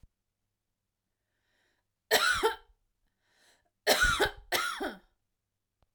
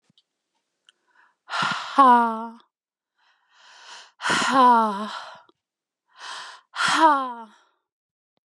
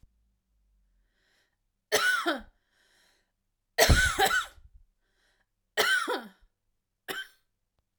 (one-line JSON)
{"cough_length": "5.9 s", "cough_amplitude": 10103, "cough_signal_mean_std_ratio": 0.36, "exhalation_length": "8.5 s", "exhalation_amplitude": 22254, "exhalation_signal_mean_std_ratio": 0.41, "three_cough_length": "8.0 s", "three_cough_amplitude": 18618, "three_cough_signal_mean_std_ratio": 0.35, "survey_phase": "alpha (2021-03-01 to 2021-08-12)", "age": "45-64", "gender": "Female", "wearing_mask": "No", "symptom_cough_any": true, "symptom_shortness_of_breath": true, "symptom_onset": "12 days", "smoker_status": "Ex-smoker", "respiratory_condition_asthma": true, "respiratory_condition_other": false, "recruitment_source": "REACT", "submission_delay": "2 days", "covid_test_result": "Negative", "covid_test_method": "RT-qPCR"}